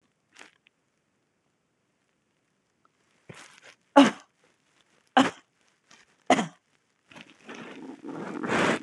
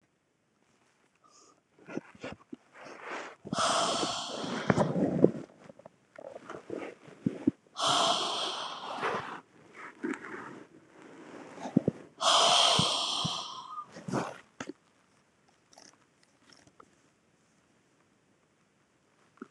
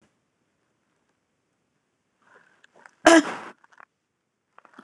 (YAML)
three_cough_length: 8.8 s
three_cough_amplitude: 25752
three_cough_signal_mean_std_ratio: 0.24
exhalation_length: 19.5 s
exhalation_amplitude: 19690
exhalation_signal_mean_std_ratio: 0.43
cough_length: 4.8 s
cough_amplitude: 26027
cough_signal_mean_std_ratio: 0.17
survey_phase: beta (2021-08-13 to 2022-03-07)
age: 18-44
gender: Female
wearing_mask: 'No'
symptom_none: true
smoker_status: Never smoked
respiratory_condition_asthma: false
respiratory_condition_other: false
recruitment_source: REACT
submission_delay: 1 day
covid_test_result: Negative
covid_test_method: RT-qPCR